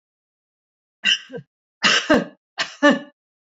{"three_cough_length": "3.5 s", "three_cough_amplitude": 28293, "three_cough_signal_mean_std_ratio": 0.36, "survey_phase": "beta (2021-08-13 to 2022-03-07)", "age": "65+", "gender": "Female", "wearing_mask": "No", "symptom_runny_or_blocked_nose": true, "smoker_status": "Never smoked", "respiratory_condition_asthma": false, "respiratory_condition_other": false, "recruitment_source": "REACT", "submission_delay": "2 days", "covid_test_result": "Negative", "covid_test_method": "RT-qPCR", "influenza_a_test_result": "Negative", "influenza_b_test_result": "Negative"}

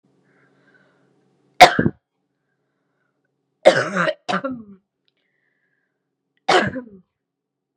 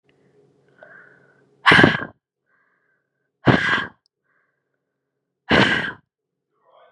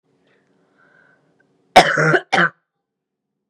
{"three_cough_length": "7.8 s", "three_cough_amplitude": 32768, "three_cough_signal_mean_std_ratio": 0.24, "exhalation_length": "6.9 s", "exhalation_amplitude": 32768, "exhalation_signal_mean_std_ratio": 0.29, "cough_length": "3.5 s", "cough_amplitude": 32768, "cough_signal_mean_std_ratio": 0.3, "survey_phase": "beta (2021-08-13 to 2022-03-07)", "age": "18-44", "gender": "Female", "wearing_mask": "No", "symptom_new_continuous_cough": true, "symptom_runny_or_blocked_nose": true, "symptom_headache": true, "symptom_change_to_sense_of_smell_or_taste": true, "symptom_onset": "2 days", "smoker_status": "Never smoked", "respiratory_condition_asthma": false, "respiratory_condition_other": false, "recruitment_source": "Test and Trace", "submission_delay": "1 day", "covid_test_result": "Positive", "covid_test_method": "RT-qPCR", "covid_ct_value": 29.6, "covid_ct_gene": "N gene"}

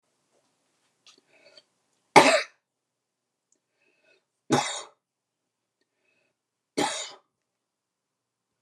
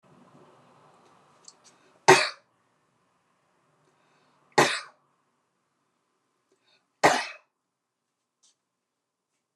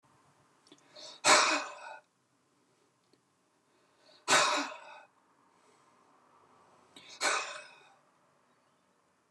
{"three_cough_length": "8.6 s", "three_cough_amplitude": 28198, "three_cough_signal_mean_std_ratio": 0.19, "cough_length": "9.6 s", "cough_amplitude": 27043, "cough_signal_mean_std_ratio": 0.18, "exhalation_length": "9.3 s", "exhalation_amplitude": 12013, "exhalation_signal_mean_std_ratio": 0.29, "survey_phase": "beta (2021-08-13 to 2022-03-07)", "age": "65+", "gender": "Female", "wearing_mask": "No", "symptom_none": true, "smoker_status": "Never smoked", "respiratory_condition_asthma": false, "respiratory_condition_other": false, "recruitment_source": "REACT", "submission_delay": "1 day", "covid_test_result": "Negative", "covid_test_method": "RT-qPCR", "influenza_a_test_result": "Negative", "influenza_b_test_result": "Negative"}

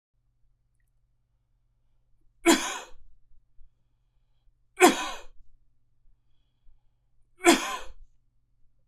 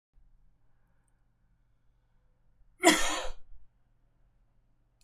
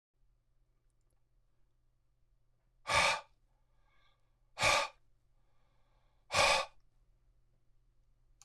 {"three_cough_length": "8.9 s", "three_cough_amplitude": 21584, "three_cough_signal_mean_std_ratio": 0.25, "cough_length": "5.0 s", "cough_amplitude": 13638, "cough_signal_mean_std_ratio": 0.26, "exhalation_length": "8.4 s", "exhalation_amplitude": 6404, "exhalation_signal_mean_std_ratio": 0.28, "survey_phase": "beta (2021-08-13 to 2022-03-07)", "age": "45-64", "gender": "Male", "wearing_mask": "No", "symptom_runny_or_blocked_nose": true, "smoker_status": "Ex-smoker", "respiratory_condition_asthma": false, "respiratory_condition_other": false, "recruitment_source": "REACT", "submission_delay": "2 days", "covid_test_result": "Negative", "covid_test_method": "RT-qPCR"}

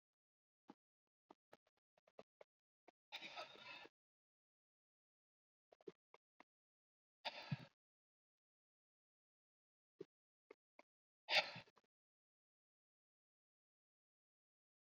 {"exhalation_length": "14.8 s", "exhalation_amplitude": 2539, "exhalation_signal_mean_std_ratio": 0.16, "survey_phase": "beta (2021-08-13 to 2022-03-07)", "age": "65+", "gender": "Male", "wearing_mask": "No", "symptom_cough_any": true, "smoker_status": "Current smoker (1 to 10 cigarettes per day)", "respiratory_condition_asthma": false, "respiratory_condition_other": false, "recruitment_source": "REACT", "submission_delay": "2 days", "covid_test_result": "Negative", "covid_test_method": "RT-qPCR"}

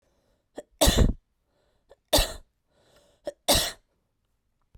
{"three_cough_length": "4.8 s", "three_cough_amplitude": 15327, "three_cough_signal_mean_std_ratio": 0.31, "survey_phase": "beta (2021-08-13 to 2022-03-07)", "age": "18-44", "gender": "Female", "wearing_mask": "No", "symptom_cough_any": true, "symptom_runny_or_blocked_nose": true, "symptom_shortness_of_breath": true, "symptom_sore_throat": true, "symptom_fatigue": true, "symptom_fever_high_temperature": true, "symptom_headache": true, "symptom_change_to_sense_of_smell_or_taste": true, "smoker_status": "Never smoked", "respiratory_condition_asthma": false, "respiratory_condition_other": false, "recruitment_source": "Test and Trace", "submission_delay": "2 days", "covid_test_result": "Positive", "covid_test_method": "RT-qPCR"}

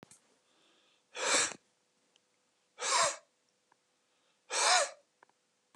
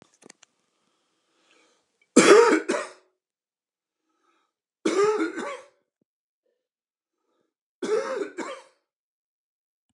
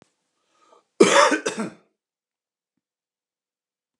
{"exhalation_length": "5.8 s", "exhalation_amplitude": 8319, "exhalation_signal_mean_std_ratio": 0.34, "three_cough_length": "9.9 s", "three_cough_amplitude": 28681, "three_cough_signal_mean_std_ratio": 0.29, "cough_length": "4.0 s", "cough_amplitude": 31745, "cough_signal_mean_std_ratio": 0.26, "survey_phase": "beta (2021-08-13 to 2022-03-07)", "age": "45-64", "gender": "Male", "wearing_mask": "No", "symptom_none": true, "symptom_onset": "8 days", "smoker_status": "Never smoked", "respiratory_condition_asthma": false, "respiratory_condition_other": false, "recruitment_source": "REACT", "submission_delay": "0 days", "covid_test_result": "Negative", "covid_test_method": "RT-qPCR"}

